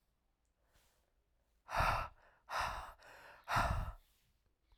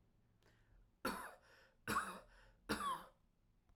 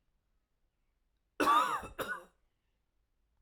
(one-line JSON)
{"exhalation_length": "4.8 s", "exhalation_amplitude": 2878, "exhalation_signal_mean_std_ratio": 0.42, "three_cough_length": "3.8 s", "three_cough_amplitude": 1437, "three_cough_signal_mean_std_ratio": 0.43, "cough_length": "3.4 s", "cough_amplitude": 4899, "cough_signal_mean_std_ratio": 0.32, "survey_phase": "beta (2021-08-13 to 2022-03-07)", "age": "18-44", "gender": "Male", "wearing_mask": "No", "symptom_none": true, "smoker_status": "Never smoked", "respiratory_condition_asthma": false, "respiratory_condition_other": false, "recruitment_source": "REACT", "submission_delay": "1 day", "covid_test_result": "Negative", "covid_test_method": "RT-qPCR"}